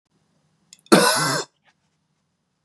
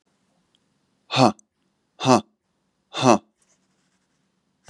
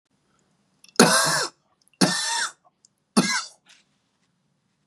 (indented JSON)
{
  "cough_length": "2.6 s",
  "cough_amplitude": 32767,
  "cough_signal_mean_std_ratio": 0.32,
  "exhalation_length": "4.7 s",
  "exhalation_amplitude": 31142,
  "exhalation_signal_mean_std_ratio": 0.24,
  "three_cough_length": "4.9 s",
  "three_cough_amplitude": 32768,
  "three_cough_signal_mean_std_ratio": 0.36,
  "survey_phase": "beta (2021-08-13 to 2022-03-07)",
  "age": "18-44",
  "gender": "Male",
  "wearing_mask": "No",
  "symptom_cough_any": true,
  "symptom_runny_or_blocked_nose": true,
  "symptom_fatigue": true,
  "symptom_other": true,
  "symptom_onset": "2 days",
  "smoker_status": "Never smoked",
  "respiratory_condition_asthma": false,
  "respiratory_condition_other": false,
  "recruitment_source": "Test and Trace",
  "submission_delay": "1 day",
  "covid_test_result": "Positive",
  "covid_test_method": "RT-qPCR",
  "covid_ct_value": 26.1,
  "covid_ct_gene": "N gene"
}